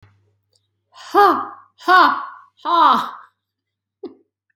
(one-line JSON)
{"exhalation_length": "4.6 s", "exhalation_amplitude": 32767, "exhalation_signal_mean_std_ratio": 0.4, "survey_phase": "beta (2021-08-13 to 2022-03-07)", "age": "18-44", "gender": "Female", "wearing_mask": "No", "symptom_none": true, "smoker_status": "Never smoked", "respiratory_condition_asthma": false, "respiratory_condition_other": false, "recruitment_source": "REACT", "submission_delay": "3 days", "covid_test_result": "Negative", "covid_test_method": "RT-qPCR", "influenza_a_test_result": "Unknown/Void", "influenza_b_test_result": "Unknown/Void"}